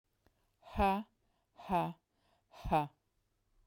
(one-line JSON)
{"exhalation_length": "3.7 s", "exhalation_amplitude": 3262, "exhalation_signal_mean_std_ratio": 0.36, "survey_phase": "beta (2021-08-13 to 2022-03-07)", "age": "65+", "gender": "Female", "wearing_mask": "No", "symptom_none": true, "smoker_status": "Never smoked", "respiratory_condition_asthma": false, "respiratory_condition_other": false, "recruitment_source": "REACT", "submission_delay": "4 days", "covid_test_result": "Negative", "covid_test_method": "RT-qPCR", "influenza_a_test_result": "Negative", "influenza_b_test_result": "Negative"}